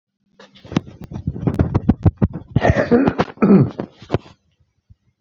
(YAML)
cough_length: 5.2 s
cough_amplitude: 31136
cough_signal_mean_std_ratio: 0.44
survey_phase: beta (2021-08-13 to 2022-03-07)
age: 65+
gender: Male
wearing_mask: 'No'
symptom_runny_or_blocked_nose: true
symptom_onset: 12 days
smoker_status: Current smoker (1 to 10 cigarettes per day)
respiratory_condition_asthma: false
respiratory_condition_other: false
recruitment_source: REACT
submission_delay: 2 days
covid_test_result: Negative
covid_test_method: RT-qPCR